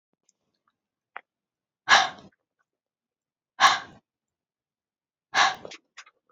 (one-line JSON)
{"exhalation_length": "6.3 s", "exhalation_amplitude": 24038, "exhalation_signal_mean_std_ratio": 0.23, "survey_phase": "beta (2021-08-13 to 2022-03-07)", "age": "18-44", "gender": "Female", "wearing_mask": "No", "symptom_cough_any": true, "symptom_shortness_of_breath": true, "symptom_sore_throat": true, "symptom_fatigue": true, "symptom_headache": true, "symptom_other": true, "symptom_onset": "2 days", "smoker_status": "Ex-smoker", "respiratory_condition_asthma": false, "respiratory_condition_other": false, "recruitment_source": "Test and Trace", "submission_delay": "1 day", "covid_test_result": "Positive", "covid_test_method": "RT-qPCR", "covid_ct_value": 27.5, "covid_ct_gene": "ORF1ab gene"}